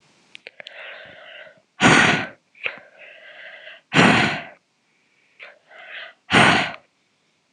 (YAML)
exhalation_length: 7.5 s
exhalation_amplitude: 26028
exhalation_signal_mean_std_ratio: 0.36
survey_phase: beta (2021-08-13 to 2022-03-07)
age: 18-44
gender: Female
wearing_mask: 'No'
symptom_cough_any: true
symptom_runny_or_blocked_nose: true
symptom_sore_throat: true
symptom_headache: true
smoker_status: Never smoked
respiratory_condition_asthma: false
respiratory_condition_other: false
recruitment_source: Test and Trace
submission_delay: 2 days
covid_test_result: Positive
covid_test_method: RT-qPCR